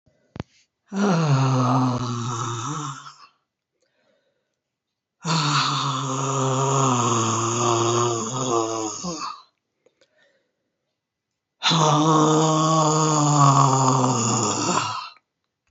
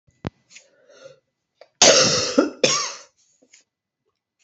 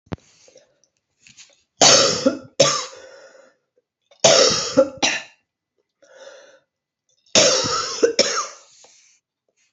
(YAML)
exhalation_length: 15.7 s
exhalation_amplitude: 23741
exhalation_signal_mean_std_ratio: 0.72
cough_length: 4.4 s
cough_amplitude: 32450
cough_signal_mean_std_ratio: 0.35
three_cough_length: 9.7 s
three_cough_amplitude: 32768
three_cough_signal_mean_std_ratio: 0.39
survey_phase: alpha (2021-03-01 to 2021-08-12)
age: 65+
gender: Female
wearing_mask: 'No'
symptom_cough_any: true
symptom_fever_high_temperature: true
smoker_status: Never smoked
respiratory_condition_asthma: false
respiratory_condition_other: false
recruitment_source: Test and Trace
submission_delay: 2 days
covid_test_result: Positive
covid_test_method: RT-qPCR
covid_ct_value: 24.6
covid_ct_gene: ORF1ab gene
covid_ct_mean: 25.5
covid_viral_load: 4300 copies/ml
covid_viral_load_category: Minimal viral load (< 10K copies/ml)